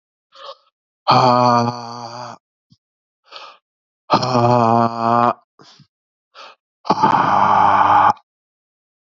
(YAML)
exhalation_length: 9.0 s
exhalation_amplitude: 32768
exhalation_signal_mean_std_ratio: 0.49
survey_phase: beta (2021-08-13 to 2022-03-07)
age: 45-64
gender: Male
wearing_mask: 'No'
symptom_cough_any: true
symptom_runny_or_blocked_nose: true
symptom_sore_throat: true
symptom_fatigue: true
symptom_headache: true
symptom_onset: 2 days
smoker_status: Never smoked
respiratory_condition_asthma: false
respiratory_condition_other: false
recruitment_source: Test and Trace
submission_delay: 2 days
covid_test_result: Positive
covid_test_method: RT-qPCR